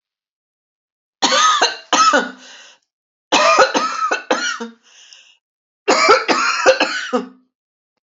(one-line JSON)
{"cough_length": "8.0 s", "cough_amplitude": 31532, "cough_signal_mean_std_ratio": 0.52, "survey_phase": "alpha (2021-03-01 to 2021-08-12)", "age": "65+", "gender": "Female", "wearing_mask": "No", "symptom_none": true, "smoker_status": "Never smoked", "respiratory_condition_asthma": false, "respiratory_condition_other": false, "recruitment_source": "REACT", "submission_delay": "3 days", "covid_test_result": "Negative", "covid_test_method": "RT-qPCR"}